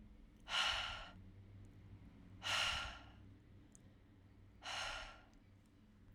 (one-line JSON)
{"exhalation_length": "6.1 s", "exhalation_amplitude": 1870, "exhalation_signal_mean_std_ratio": 0.53, "survey_phase": "alpha (2021-03-01 to 2021-08-12)", "age": "18-44", "gender": "Female", "wearing_mask": "No", "symptom_fatigue": true, "smoker_status": "Prefer not to say", "respiratory_condition_asthma": false, "respiratory_condition_other": false, "recruitment_source": "REACT", "submission_delay": "2 days", "covid_test_result": "Negative", "covid_test_method": "RT-qPCR"}